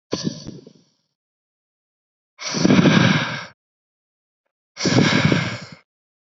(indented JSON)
{
  "exhalation_length": "6.2 s",
  "exhalation_amplitude": 27904,
  "exhalation_signal_mean_std_ratio": 0.43,
  "survey_phase": "beta (2021-08-13 to 2022-03-07)",
  "age": "18-44",
  "gender": "Male",
  "wearing_mask": "No",
  "symptom_headache": true,
  "smoker_status": "Current smoker (11 or more cigarettes per day)",
  "respiratory_condition_asthma": false,
  "respiratory_condition_other": false,
  "recruitment_source": "REACT",
  "submission_delay": "1 day",
  "covid_test_result": "Negative",
  "covid_test_method": "RT-qPCR",
  "influenza_a_test_result": "Negative",
  "influenza_b_test_result": "Negative"
}